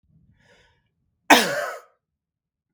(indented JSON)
{
  "cough_length": "2.7 s",
  "cough_amplitude": 32768,
  "cough_signal_mean_std_ratio": 0.24,
  "survey_phase": "beta (2021-08-13 to 2022-03-07)",
  "age": "65+",
  "gender": "Male",
  "wearing_mask": "No",
  "symptom_cough_any": true,
  "symptom_runny_or_blocked_nose": true,
  "smoker_status": "Prefer not to say",
  "respiratory_condition_asthma": false,
  "respiratory_condition_other": false,
  "recruitment_source": "REACT",
  "submission_delay": "2 days",
  "covid_test_result": "Negative",
  "covid_test_method": "RT-qPCR"
}